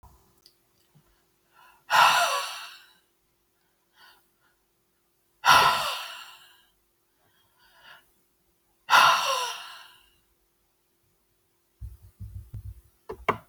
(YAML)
exhalation_length: 13.5 s
exhalation_amplitude: 19221
exhalation_signal_mean_std_ratio: 0.3
survey_phase: alpha (2021-03-01 to 2021-08-12)
age: 65+
gender: Female
wearing_mask: 'No'
symptom_none: true
smoker_status: Never smoked
respiratory_condition_asthma: false
respiratory_condition_other: false
recruitment_source: REACT
submission_delay: 2 days
covid_test_result: Negative
covid_test_method: RT-qPCR